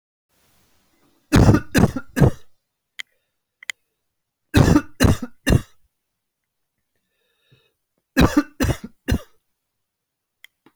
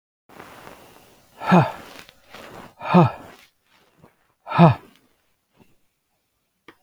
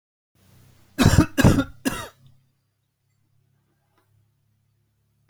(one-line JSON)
{"three_cough_length": "10.8 s", "three_cough_amplitude": 28422, "three_cough_signal_mean_std_ratio": 0.31, "exhalation_length": "6.8 s", "exhalation_amplitude": 26197, "exhalation_signal_mean_std_ratio": 0.27, "cough_length": "5.3 s", "cough_amplitude": 26364, "cough_signal_mean_std_ratio": 0.26, "survey_phase": "alpha (2021-03-01 to 2021-08-12)", "age": "18-44", "gender": "Male", "wearing_mask": "No", "symptom_none": true, "smoker_status": "Never smoked", "respiratory_condition_asthma": false, "respiratory_condition_other": false, "recruitment_source": "REACT", "submission_delay": "2 days", "covid_test_result": "Negative", "covid_test_method": "RT-qPCR"}